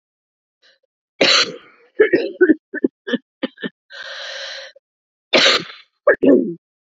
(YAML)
cough_length: 6.9 s
cough_amplitude: 32257
cough_signal_mean_std_ratio: 0.4
survey_phase: beta (2021-08-13 to 2022-03-07)
age: 45-64
gender: Female
wearing_mask: 'No'
symptom_cough_any: true
symptom_new_continuous_cough: true
symptom_runny_or_blocked_nose: true
symptom_sore_throat: true
symptom_fatigue: true
symptom_headache: true
symptom_change_to_sense_of_smell_or_taste: true
symptom_loss_of_taste: true
smoker_status: Never smoked
respiratory_condition_asthma: false
respiratory_condition_other: false
recruitment_source: Test and Trace
submission_delay: 1 day
covid_test_result: Positive
covid_test_method: RT-qPCR
covid_ct_value: 14.1
covid_ct_gene: ORF1ab gene
covid_ct_mean: 14.6
covid_viral_load: 17000000 copies/ml
covid_viral_load_category: High viral load (>1M copies/ml)